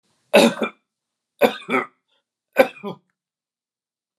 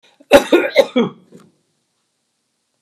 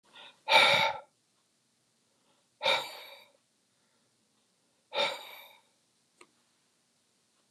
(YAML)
three_cough_length: 4.2 s
three_cough_amplitude: 32449
three_cough_signal_mean_std_ratio: 0.28
cough_length: 2.8 s
cough_amplitude: 32768
cough_signal_mean_std_ratio: 0.32
exhalation_length: 7.5 s
exhalation_amplitude: 11616
exhalation_signal_mean_std_ratio: 0.28
survey_phase: beta (2021-08-13 to 2022-03-07)
age: 45-64
gender: Male
wearing_mask: 'No'
symptom_none: true
smoker_status: Never smoked
respiratory_condition_asthma: false
respiratory_condition_other: false
recruitment_source: REACT
submission_delay: 1 day
covid_test_result: Negative
covid_test_method: RT-qPCR
influenza_a_test_result: Negative
influenza_b_test_result: Negative